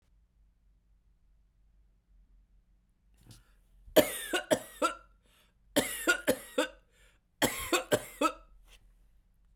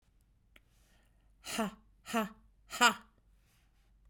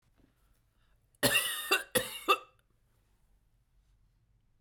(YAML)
three_cough_length: 9.6 s
three_cough_amplitude: 15311
three_cough_signal_mean_std_ratio: 0.31
exhalation_length: 4.1 s
exhalation_amplitude: 9440
exhalation_signal_mean_std_ratio: 0.26
cough_length: 4.6 s
cough_amplitude: 6699
cough_signal_mean_std_ratio: 0.31
survey_phase: beta (2021-08-13 to 2022-03-07)
age: 45-64
gender: Female
wearing_mask: 'No'
symptom_none: true
smoker_status: Ex-smoker
respiratory_condition_asthma: false
respiratory_condition_other: false
recruitment_source: REACT
submission_delay: 3 days
covid_test_result: Negative
covid_test_method: RT-qPCR
influenza_a_test_result: Negative
influenza_b_test_result: Negative